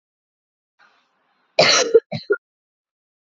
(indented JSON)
{
  "cough_length": "3.3 s",
  "cough_amplitude": 29503,
  "cough_signal_mean_std_ratio": 0.29,
  "survey_phase": "alpha (2021-03-01 to 2021-08-12)",
  "age": "18-44",
  "gender": "Female",
  "wearing_mask": "No",
  "symptom_cough_any": true,
  "symptom_fever_high_temperature": true,
  "symptom_headache": true,
  "symptom_change_to_sense_of_smell_or_taste": true,
  "symptom_loss_of_taste": true,
  "symptom_onset": "3 days",
  "smoker_status": "Never smoked",
  "respiratory_condition_asthma": false,
  "respiratory_condition_other": false,
  "recruitment_source": "Test and Trace",
  "submission_delay": "1 day",
  "covid_test_result": "Positive",
  "covid_test_method": "RT-qPCR"
}